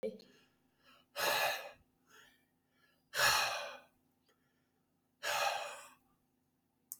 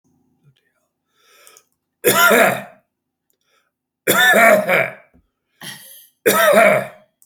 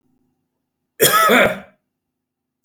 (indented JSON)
{
  "exhalation_length": "7.0 s",
  "exhalation_amplitude": 4313,
  "exhalation_signal_mean_std_ratio": 0.39,
  "three_cough_length": "7.3 s",
  "three_cough_amplitude": 32647,
  "three_cough_signal_mean_std_ratio": 0.44,
  "cough_length": "2.6 s",
  "cough_amplitude": 32767,
  "cough_signal_mean_std_ratio": 0.38,
  "survey_phase": "beta (2021-08-13 to 2022-03-07)",
  "age": "65+",
  "gender": "Male",
  "wearing_mask": "No",
  "symptom_none": true,
  "smoker_status": "Never smoked",
  "respiratory_condition_asthma": false,
  "respiratory_condition_other": false,
  "recruitment_source": "REACT",
  "submission_delay": "26 days",
  "covid_test_result": "Negative",
  "covid_test_method": "RT-qPCR"
}